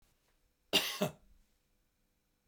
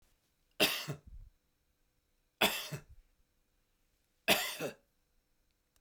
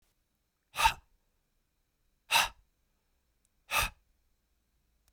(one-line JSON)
{"cough_length": "2.5 s", "cough_amplitude": 6776, "cough_signal_mean_std_ratio": 0.27, "three_cough_length": "5.8 s", "three_cough_amplitude": 6426, "three_cough_signal_mean_std_ratio": 0.3, "exhalation_length": "5.1 s", "exhalation_amplitude": 8018, "exhalation_signal_mean_std_ratio": 0.24, "survey_phase": "beta (2021-08-13 to 2022-03-07)", "age": "45-64", "gender": "Male", "wearing_mask": "No", "symptom_runny_or_blocked_nose": true, "smoker_status": "Never smoked", "respiratory_condition_asthma": false, "respiratory_condition_other": false, "recruitment_source": "REACT", "submission_delay": "3 days", "covid_test_result": "Negative", "covid_test_method": "RT-qPCR", "influenza_a_test_result": "Negative", "influenza_b_test_result": "Negative"}